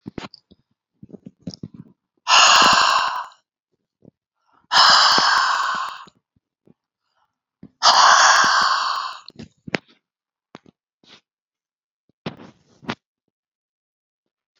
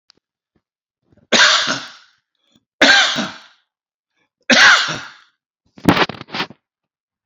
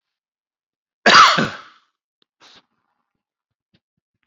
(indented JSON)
{
  "exhalation_length": "14.6 s",
  "exhalation_amplitude": 30553,
  "exhalation_signal_mean_std_ratio": 0.39,
  "three_cough_length": "7.3 s",
  "three_cough_amplitude": 32768,
  "three_cough_signal_mean_std_ratio": 0.37,
  "cough_length": "4.3 s",
  "cough_amplitude": 29291,
  "cough_signal_mean_std_ratio": 0.24,
  "survey_phase": "beta (2021-08-13 to 2022-03-07)",
  "age": "65+",
  "gender": "Male",
  "wearing_mask": "No",
  "symptom_none": true,
  "smoker_status": "Ex-smoker",
  "respiratory_condition_asthma": false,
  "respiratory_condition_other": true,
  "recruitment_source": "REACT",
  "submission_delay": "2 days",
  "covid_test_result": "Negative",
  "covid_test_method": "RT-qPCR"
}